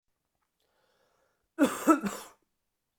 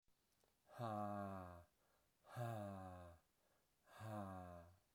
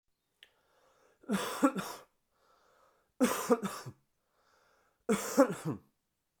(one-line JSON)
{"cough_length": "3.0 s", "cough_amplitude": 10742, "cough_signal_mean_std_ratio": 0.27, "exhalation_length": "4.9 s", "exhalation_amplitude": 537, "exhalation_signal_mean_std_ratio": 0.6, "three_cough_length": "6.4 s", "three_cough_amplitude": 8528, "three_cough_signal_mean_std_ratio": 0.34, "survey_phase": "beta (2021-08-13 to 2022-03-07)", "age": "18-44", "gender": "Male", "wearing_mask": "No", "symptom_cough_any": true, "symptom_runny_or_blocked_nose": true, "symptom_change_to_sense_of_smell_or_taste": true, "symptom_loss_of_taste": true, "symptom_onset": "2 days", "smoker_status": "Never smoked", "respiratory_condition_asthma": false, "respiratory_condition_other": false, "recruitment_source": "Test and Trace", "submission_delay": "2 days", "covid_test_result": "Positive", "covid_test_method": "LAMP"}